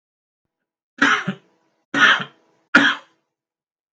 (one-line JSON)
{"three_cough_length": "3.9 s", "three_cough_amplitude": 28947, "three_cough_signal_mean_std_ratio": 0.34, "survey_phase": "beta (2021-08-13 to 2022-03-07)", "age": "65+", "gender": "Male", "wearing_mask": "No", "symptom_none": true, "smoker_status": "Never smoked", "respiratory_condition_asthma": false, "respiratory_condition_other": false, "recruitment_source": "REACT", "submission_delay": "3 days", "covid_test_result": "Negative", "covid_test_method": "RT-qPCR", "influenza_a_test_result": "Negative", "influenza_b_test_result": "Negative"}